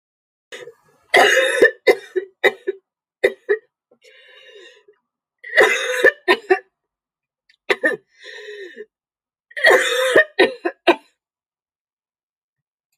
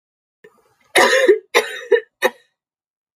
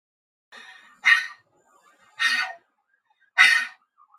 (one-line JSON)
{"three_cough_length": "13.0 s", "three_cough_amplitude": 29472, "three_cough_signal_mean_std_ratio": 0.36, "cough_length": "3.2 s", "cough_amplitude": 29792, "cough_signal_mean_std_ratio": 0.39, "exhalation_length": "4.2 s", "exhalation_amplitude": 26220, "exhalation_signal_mean_std_ratio": 0.33, "survey_phase": "alpha (2021-03-01 to 2021-08-12)", "age": "45-64", "gender": "Female", "wearing_mask": "No", "symptom_none": true, "symptom_onset": "12 days", "smoker_status": "Never smoked", "respiratory_condition_asthma": true, "respiratory_condition_other": false, "recruitment_source": "REACT", "submission_delay": "1 day", "covid_test_result": "Negative", "covid_test_method": "RT-qPCR", "covid_ct_value": 46.0, "covid_ct_gene": "N gene"}